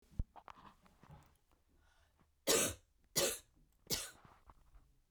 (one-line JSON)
{"three_cough_length": "5.1 s", "three_cough_amplitude": 4119, "three_cough_signal_mean_std_ratio": 0.31, "survey_phase": "beta (2021-08-13 to 2022-03-07)", "age": "45-64", "gender": "Female", "wearing_mask": "No", "symptom_cough_any": true, "symptom_runny_or_blocked_nose": true, "symptom_shortness_of_breath": true, "symptom_sore_throat": true, "symptom_fatigue": true, "symptom_headache": true, "symptom_onset": "2 days", "smoker_status": "Ex-smoker", "respiratory_condition_asthma": false, "respiratory_condition_other": false, "recruitment_source": "Test and Trace", "submission_delay": "1 day", "covid_test_result": "Positive", "covid_test_method": "RT-qPCR"}